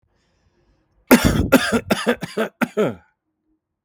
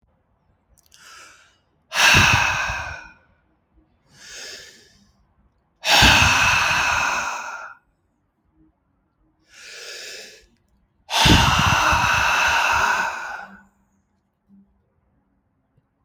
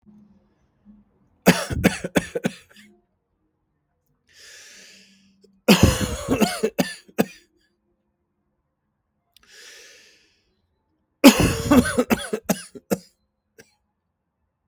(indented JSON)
{
  "cough_length": "3.8 s",
  "cough_amplitude": 32768,
  "cough_signal_mean_std_ratio": 0.41,
  "exhalation_length": "16.0 s",
  "exhalation_amplitude": 30935,
  "exhalation_signal_mean_std_ratio": 0.46,
  "three_cough_length": "14.7 s",
  "three_cough_amplitude": 32766,
  "three_cough_signal_mean_std_ratio": 0.29,
  "survey_phase": "beta (2021-08-13 to 2022-03-07)",
  "age": "18-44",
  "gender": "Male",
  "wearing_mask": "No",
  "symptom_none": true,
  "smoker_status": "Never smoked",
  "respiratory_condition_asthma": false,
  "respiratory_condition_other": false,
  "recruitment_source": "REACT",
  "submission_delay": "2 days",
  "covid_test_result": "Negative",
  "covid_test_method": "RT-qPCR"
}